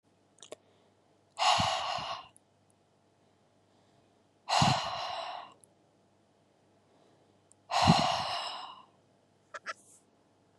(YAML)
exhalation_length: 10.6 s
exhalation_amplitude: 11321
exhalation_signal_mean_std_ratio: 0.37
survey_phase: beta (2021-08-13 to 2022-03-07)
age: 18-44
gender: Female
wearing_mask: 'No'
symptom_none: true
symptom_onset: 12 days
smoker_status: Never smoked
respiratory_condition_asthma: false
respiratory_condition_other: false
recruitment_source: REACT
submission_delay: 1 day
covid_test_result: Negative
covid_test_method: RT-qPCR
influenza_a_test_result: Negative
influenza_b_test_result: Negative